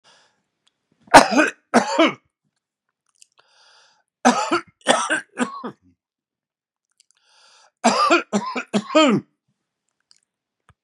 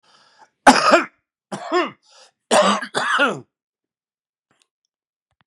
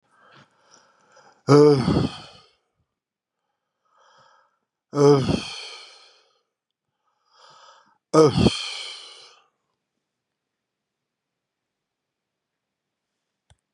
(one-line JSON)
{"three_cough_length": "10.8 s", "three_cough_amplitude": 32768, "three_cough_signal_mean_std_ratio": 0.34, "cough_length": "5.5 s", "cough_amplitude": 32768, "cough_signal_mean_std_ratio": 0.36, "exhalation_length": "13.7 s", "exhalation_amplitude": 23758, "exhalation_signal_mean_std_ratio": 0.26, "survey_phase": "beta (2021-08-13 to 2022-03-07)", "age": "65+", "gender": "Male", "wearing_mask": "No", "symptom_loss_of_taste": true, "symptom_onset": "2 days", "smoker_status": "Ex-smoker", "respiratory_condition_asthma": false, "respiratory_condition_other": false, "recruitment_source": "Test and Trace", "submission_delay": "1 day", "covid_test_result": "Positive", "covid_test_method": "ePCR"}